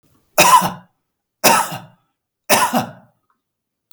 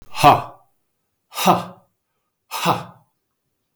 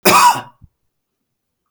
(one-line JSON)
{"three_cough_length": "3.9 s", "three_cough_amplitude": 32768, "three_cough_signal_mean_std_ratio": 0.39, "exhalation_length": "3.8 s", "exhalation_amplitude": 32768, "exhalation_signal_mean_std_ratio": 0.32, "cough_length": "1.7 s", "cough_amplitude": 32768, "cough_signal_mean_std_ratio": 0.37, "survey_phase": "beta (2021-08-13 to 2022-03-07)", "age": "45-64", "gender": "Male", "wearing_mask": "No", "symptom_none": true, "smoker_status": "Never smoked", "respiratory_condition_asthma": false, "respiratory_condition_other": false, "recruitment_source": "REACT", "submission_delay": "1 day", "covid_test_result": "Negative", "covid_test_method": "RT-qPCR", "influenza_a_test_result": "Negative", "influenza_b_test_result": "Negative"}